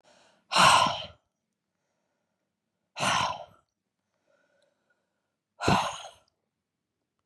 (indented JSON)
{
  "exhalation_length": "7.3 s",
  "exhalation_amplitude": 15126,
  "exhalation_signal_mean_std_ratio": 0.3,
  "survey_phase": "beta (2021-08-13 to 2022-03-07)",
  "age": "45-64",
  "gender": "Female",
  "wearing_mask": "No",
  "symptom_none": true,
  "smoker_status": "Never smoked",
  "respiratory_condition_asthma": false,
  "respiratory_condition_other": false,
  "recruitment_source": "REACT",
  "submission_delay": "2 days",
  "covid_test_result": "Negative",
  "covid_test_method": "RT-qPCR",
  "influenza_a_test_result": "Negative",
  "influenza_b_test_result": "Negative"
}